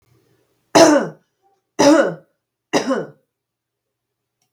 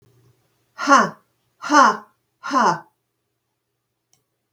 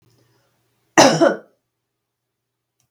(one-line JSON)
{"three_cough_length": "4.5 s", "three_cough_amplitude": 32768, "three_cough_signal_mean_std_ratio": 0.35, "exhalation_length": "4.5 s", "exhalation_amplitude": 32712, "exhalation_signal_mean_std_ratio": 0.33, "cough_length": "2.9 s", "cough_amplitude": 32768, "cough_signal_mean_std_ratio": 0.27, "survey_phase": "beta (2021-08-13 to 2022-03-07)", "age": "45-64", "gender": "Female", "wearing_mask": "No", "symptom_none": true, "smoker_status": "Never smoked", "respiratory_condition_asthma": false, "respiratory_condition_other": false, "recruitment_source": "REACT", "submission_delay": "1 day", "covid_test_result": "Negative", "covid_test_method": "RT-qPCR", "influenza_a_test_result": "Negative", "influenza_b_test_result": "Negative"}